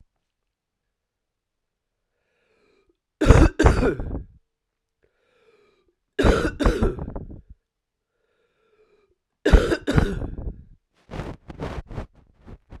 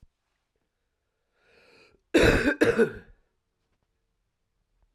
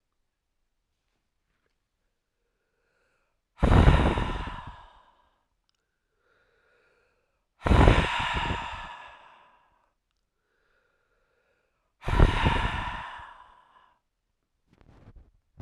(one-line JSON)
{"three_cough_length": "12.8 s", "three_cough_amplitude": 32768, "three_cough_signal_mean_std_ratio": 0.32, "cough_length": "4.9 s", "cough_amplitude": 16509, "cough_signal_mean_std_ratio": 0.29, "exhalation_length": "15.6 s", "exhalation_amplitude": 20283, "exhalation_signal_mean_std_ratio": 0.31, "survey_phase": "beta (2021-08-13 to 2022-03-07)", "age": "45-64", "gender": "Male", "wearing_mask": "No", "symptom_cough_any": true, "symptom_runny_or_blocked_nose": true, "symptom_change_to_sense_of_smell_or_taste": true, "smoker_status": "Ex-smoker", "respiratory_condition_asthma": false, "respiratory_condition_other": false, "recruitment_source": "Test and Trace", "submission_delay": "2 days", "covid_test_result": "Positive", "covid_test_method": "RT-qPCR", "covid_ct_value": 15.8, "covid_ct_gene": "ORF1ab gene", "covid_ct_mean": 16.3, "covid_viral_load": "4500000 copies/ml", "covid_viral_load_category": "High viral load (>1M copies/ml)"}